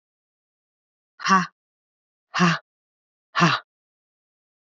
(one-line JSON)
{"exhalation_length": "4.7 s", "exhalation_amplitude": 21158, "exhalation_signal_mean_std_ratio": 0.29, "survey_phase": "alpha (2021-03-01 to 2021-08-12)", "age": "45-64", "gender": "Female", "wearing_mask": "No", "symptom_cough_any": true, "symptom_fever_high_temperature": true, "symptom_headache": true, "symptom_onset": "3 days", "smoker_status": "Never smoked", "respiratory_condition_asthma": false, "respiratory_condition_other": false, "recruitment_source": "Test and Trace", "submission_delay": "1 day", "covid_test_result": "Positive", "covid_test_method": "RT-qPCR"}